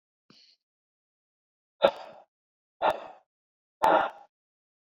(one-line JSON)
{"exhalation_length": "4.9 s", "exhalation_amplitude": 18272, "exhalation_signal_mean_std_ratio": 0.25, "survey_phase": "beta (2021-08-13 to 2022-03-07)", "age": "45-64", "gender": "Male", "wearing_mask": "No", "symptom_none": true, "smoker_status": "Current smoker (1 to 10 cigarettes per day)", "respiratory_condition_asthma": false, "respiratory_condition_other": false, "recruitment_source": "REACT", "submission_delay": "2 days", "covid_test_result": "Negative", "covid_test_method": "RT-qPCR", "influenza_a_test_result": "Negative", "influenza_b_test_result": "Negative"}